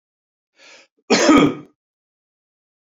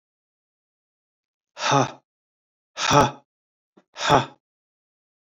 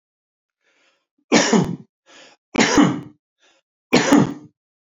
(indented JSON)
{
  "cough_length": "2.8 s",
  "cough_amplitude": 28285,
  "cough_signal_mean_std_ratio": 0.32,
  "exhalation_length": "5.4 s",
  "exhalation_amplitude": 26841,
  "exhalation_signal_mean_std_ratio": 0.29,
  "three_cough_length": "4.9 s",
  "three_cough_amplitude": 30940,
  "three_cough_signal_mean_std_ratio": 0.4,
  "survey_phase": "beta (2021-08-13 to 2022-03-07)",
  "age": "45-64",
  "gender": "Male",
  "wearing_mask": "No",
  "symptom_none": true,
  "smoker_status": "Never smoked",
  "respiratory_condition_asthma": false,
  "respiratory_condition_other": false,
  "recruitment_source": "Test and Trace",
  "submission_delay": "2 days",
  "covid_test_result": "Negative",
  "covid_test_method": "RT-qPCR"
}